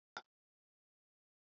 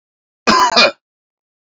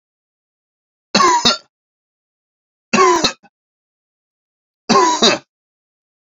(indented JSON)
{
  "exhalation_length": "1.5 s",
  "exhalation_amplitude": 992,
  "exhalation_signal_mean_std_ratio": 0.11,
  "cough_length": "1.6 s",
  "cough_amplitude": 30360,
  "cough_signal_mean_std_ratio": 0.43,
  "three_cough_length": "6.4 s",
  "three_cough_amplitude": 32768,
  "three_cough_signal_mean_std_ratio": 0.36,
  "survey_phase": "beta (2021-08-13 to 2022-03-07)",
  "age": "18-44",
  "gender": "Male",
  "wearing_mask": "No",
  "symptom_cough_any": true,
  "symptom_runny_or_blocked_nose": true,
  "symptom_diarrhoea": true,
  "symptom_fever_high_temperature": true,
  "symptom_loss_of_taste": true,
  "symptom_onset": "5 days",
  "smoker_status": "Never smoked",
  "respiratory_condition_asthma": false,
  "respiratory_condition_other": false,
  "recruitment_source": "Test and Trace",
  "submission_delay": "2 days",
  "covid_test_result": "Positive",
  "covid_test_method": "RT-qPCR"
}